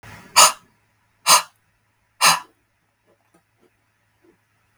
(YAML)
exhalation_length: 4.8 s
exhalation_amplitude: 32768
exhalation_signal_mean_std_ratio: 0.25
survey_phase: beta (2021-08-13 to 2022-03-07)
age: 18-44
gender: Female
wearing_mask: 'No'
symptom_none: true
smoker_status: Ex-smoker
respiratory_condition_asthma: false
respiratory_condition_other: false
recruitment_source: Test and Trace
submission_delay: 3 days
covid_test_result: Negative
covid_test_method: RT-qPCR